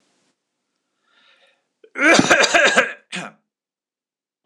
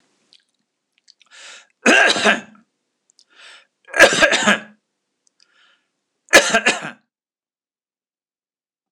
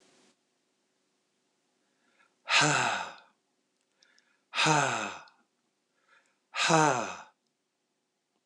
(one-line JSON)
{"cough_length": "4.5 s", "cough_amplitude": 26028, "cough_signal_mean_std_ratio": 0.35, "three_cough_length": "8.9 s", "three_cough_amplitude": 26028, "three_cough_signal_mean_std_ratio": 0.31, "exhalation_length": "8.5 s", "exhalation_amplitude": 14676, "exhalation_signal_mean_std_ratio": 0.34, "survey_phase": "alpha (2021-03-01 to 2021-08-12)", "age": "65+", "gender": "Male", "wearing_mask": "No", "symptom_none": true, "smoker_status": "Never smoked", "respiratory_condition_asthma": false, "respiratory_condition_other": false, "recruitment_source": "REACT", "submission_delay": "2 days", "covid_test_result": "Negative", "covid_test_method": "RT-qPCR"}